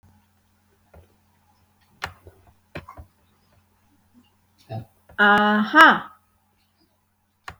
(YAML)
exhalation_length: 7.6 s
exhalation_amplitude: 31799
exhalation_signal_mean_std_ratio: 0.26
survey_phase: beta (2021-08-13 to 2022-03-07)
age: 45-64
gender: Female
wearing_mask: 'No'
symptom_none: true
smoker_status: Never smoked
respiratory_condition_asthma: false
respiratory_condition_other: false
recruitment_source: REACT
submission_delay: 1 day
covid_test_result: Negative
covid_test_method: RT-qPCR
influenza_a_test_result: Negative
influenza_b_test_result: Negative